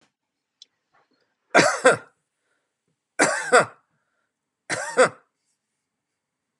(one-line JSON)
{"three_cough_length": "6.6 s", "three_cough_amplitude": 29744, "three_cough_signal_mean_std_ratio": 0.28, "survey_phase": "beta (2021-08-13 to 2022-03-07)", "age": "65+", "gender": "Male", "wearing_mask": "No", "symptom_none": true, "smoker_status": "Never smoked", "respiratory_condition_asthma": false, "respiratory_condition_other": false, "recruitment_source": "REACT", "submission_delay": "1 day", "covid_test_result": "Negative", "covid_test_method": "RT-qPCR", "influenza_a_test_result": "Negative", "influenza_b_test_result": "Negative"}